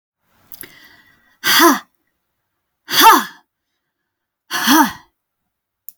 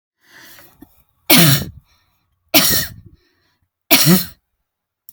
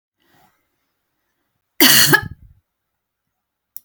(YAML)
exhalation_length: 6.0 s
exhalation_amplitude: 32768
exhalation_signal_mean_std_ratio: 0.33
three_cough_length: 5.1 s
three_cough_amplitude: 32768
three_cough_signal_mean_std_ratio: 0.36
cough_length: 3.8 s
cough_amplitude: 32768
cough_signal_mean_std_ratio: 0.26
survey_phase: beta (2021-08-13 to 2022-03-07)
age: 45-64
gender: Female
wearing_mask: 'No'
symptom_none: true
smoker_status: Never smoked
respiratory_condition_asthma: false
respiratory_condition_other: false
recruitment_source: REACT
submission_delay: 1 day
covid_test_result: Negative
covid_test_method: RT-qPCR